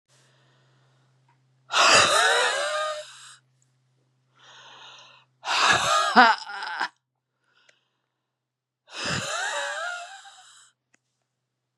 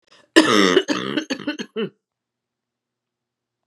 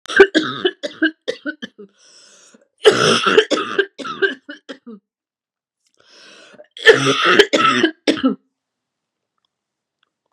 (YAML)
exhalation_length: 11.8 s
exhalation_amplitude: 30698
exhalation_signal_mean_std_ratio: 0.4
cough_length: 3.7 s
cough_amplitude: 32768
cough_signal_mean_std_ratio: 0.37
three_cough_length: 10.3 s
three_cough_amplitude: 32768
three_cough_signal_mean_std_ratio: 0.4
survey_phase: beta (2021-08-13 to 2022-03-07)
age: 45-64
gender: Female
wearing_mask: 'No'
symptom_cough_any: true
symptom_runny_or_blocked_nose: true
symptom_sore_throat: true
symptom_diarrhoea: true
symptom_headache: true
symptom_onset: 2 days
smoker_status: Ex-smoker
respiratory_condition_asthma: false
respiratory_condition_other: false
recruitment_source: Test and Trace
submission_delay: 1 day
covid_test_result: Positive
covid_test_method: RT-qPCR
covid_ct_value: 18.8
covid_ct_gene: N gene